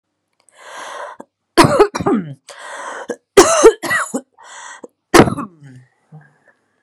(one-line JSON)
{"three_cough_length": "6.8 s", "three_cough_amplitude": 32768, "three_cough_signal_mean_std_ratio": 0.37, "survey_phase": "beta (2021-08-13 to 2022-03-07)", "age": "18-44", "gender": "Female", "wearing_mask": "No", "symptom_none": true, "smoker_status": "Never smoked", "respiratory_condition_asthma": false, "respiratory_condition_other": false, "recruitment_source": "REACT", "submission_delay": "6 days", "covid_test_result": "Negative", "covid_test_method": "RT-qPCR"}